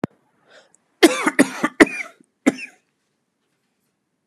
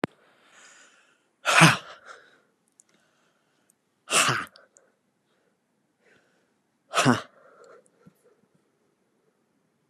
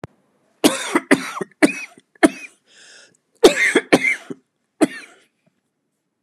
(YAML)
cough_length: 4.3 s
cough_amplitude: 32768
cough_signal_mean_std_ratio: 0.26
exhalation_length: 9.9 s
exhalation_amplitude: 26889
exhalation_signal_mean_std_ratio: 0.23
three_cough_length: 6.2 s
three_cough_amplitude: 32768
three_cough_signal_mean_std_ratio: 0.33
survey_phase: beta (2021-08-13 to 2022-03-07)
age: 18-44
gender: Male
wearing_mask: 'No'
symptom_cough_any: true
symptom_fatigue: true
symptom_onset: 10 days
smoker_status: Never smoked
respiratory_condition_asthma: true
respiratory_condition_other: false
recruitment_source: REACT
submission_delay: 1 day
covid_test_result: Positive
covid_test_method: RT-qPCR
covid_ct_value: 30.0
covid_ct_gene: N gene
influenza_a_test_result: Unknown/Void
influenza_b_test_result: Unknown/Void